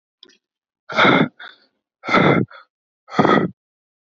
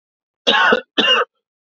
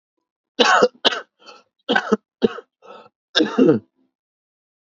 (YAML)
exhalation_length: 4.1 s
exhalation_amplitude: 27398
exhalation_signal_mean_std_ratio: 0.41
cough_length: 1.8 s
cough_amplitude: 29438
cough_signal_mean_std_ratio: 0.5
three_cough_length: 4.9 s
three_cough_amplitude: 30997
three_cough_signal_mean_std_ratio: 0.36
survey_phase: beta (2021-08-13 to 2022-03-07)
age: 18-44
gender: Male
wearing_mask: 'No'
symptom_cough_any: true
symptom_runny_or_blocked_nose: true
symptom_sore_throat: true
symptom_headache: true
smoker_status: Ex-smoker
respiratory_condition_asthma: false
respiratory_condition_other: false
recruitment_source: Test and Trace
submission_delay: 2 days
covid_test_result: Positive
covid_test_method: RT-qPCR
covid_ct_value: 29.2
covid_ct_gene: ORF1ab gene
covid_ct_mean: 30.6
covid_viral_load: 93 copies/ml
covid_viral_load_category: Minimal viral load (< 10K copies/ml)